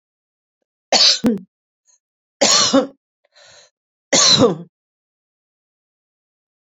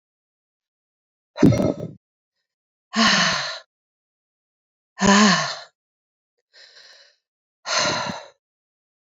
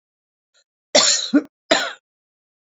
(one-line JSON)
{"three_cough_length": "6.7 s", "three_cough_amplitude": 31686, "three_cough_signal_mean_std_ratio": 0.35, "exhalation_length": "9.1 s", "exhalation_amplitude": 27001, "exhalation_signal_mean_std_ratio": 0.35, "cough_length": "2.7 s", "cough_amplitude": 28864, "cough_signal_mean_std_ratio": 0.35, "survey_phase": "beta (2021-08-13 to 2022-03-07)", "age": "45-64", "gender": "Female", "wearing_mask": "No", "symptom_none": true, "smoker_status": "Never smoked", "respiratory_condition_asthma": false, "respiratory_condition_other": false, "recruitment_source": "REACT", "submission_delay": "1 day", "covid_test_result": "Negative", "covid_test_method": "RT-qPCR", "influenza_a_test_result": "Negative", "influenza_b_test_result": "Negative"}